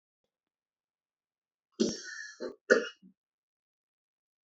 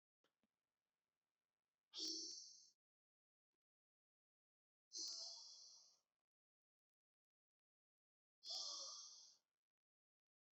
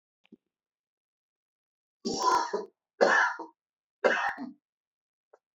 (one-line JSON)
{"cough_length": "4.4 s", "cough_amplitude": 12020, "cough_signal_mean_std_ratio": 0.22, "exhalation_length": "10.6 s", "exhalation_amplitude": 565, "exhalation_signal_mean_std_ratio": 0.35, "three_cough_length": "5.5 s", "three_cough_amplitude": 13954, "three_cough_signal_mean_std_ratio": 0.37, "survey_phase": "beta (2021-08-13 to 2022-03-07)", "age": "45-64", "gender": "Male", "wearing_mask": "No", "symptom_cough_any": true, "symptom_runny_or_blocked_nose": true, "symptom_shortness_of_breath": true, "symptom_sore_throat": true, "symptom_diarrhoea": true, "symptom_fatigue": true, "symptom_headache": true, "symptom_onset": "3 days", "smoker_status": "Never smoked", "respiratory_condition_asthma": false, "respiratory_condition_other": false, "recruitment_source": "Test and Trace", "submission_delay": "2 days", "covid_test_result": "Positive", "covid_test_method": "ePCR"}